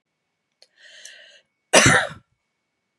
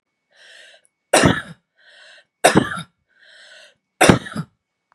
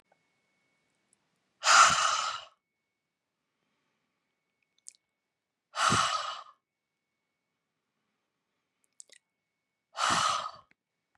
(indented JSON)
{
  "cough_length": "3.0 s",
  "cough_amplitude": 32767,
  "cough_signal_mean_std_ratio": 0.27,
  "three_cough_length": "4.9 s",
  "three_cough_amplitude": 32768,
  "three_cough_signal_mean_std_ratio": 0.3,
  "exhalation_length": "11.2 s",
  "exhalation_amplitude": 14021,
  "exhalation_signal_mean_std_ratio": 0.29,
  "survey_phase": "beta (2021-08-13 to 2022-03-07)",
  "age": "45-64",
  "gender": "Female",
  "wearing_mask": "No",
  "symptom_none": true,
  "smoker_status": "Never smoked",
  "respiratory_condition_asthma": false,
  "respiratory_condition_other": false,
  "recruitment_source": "REACT",
  "submission_delay": "1 day",
  "covid_test_result": "Negative",
  "covid_test_method": "RT-qPCR"
}